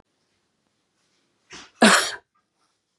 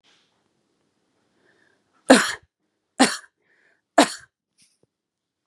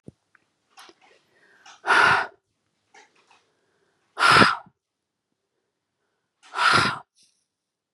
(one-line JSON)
{"cough_length": "3.0 s", "cough_amplitude": 27686, "cough_signal_mean_std_ratio": 0.24, "three_cough_length": "5.5 s", "three_cough_amplitude": 32767, "three_cough_signal_mean_std_ratio": 0.2, "exhalation_length": "7.9 s", "exhalation_amplitude": 32176, "exhalation_signal_mean_std_ratio": 0.3, "survey_phase": "beta (2021-08-13 to 2022-03-07)", "age": "18-44", "gender": "Female", "wearing_mask": "No", "symptom_cough_any": true, "symptom_runny_or_blocked_nose": true, "symptom_sore_throat": true, "symptom_fatigue": true, "symptom_headache": true, "symptom_onset": "8 days", "smoker_status": "Never smoked", "respiratory_condition_asthma": false, "respiratory_condition_other": false, "recruitment_source": "REACT", "submission_delay": "1 day", "covid_test_result": "Negative", "covid_test_method": "RT-qPCR", "influenza_a_test_result": "Negative", "influenza_b_test_result": "Negative"}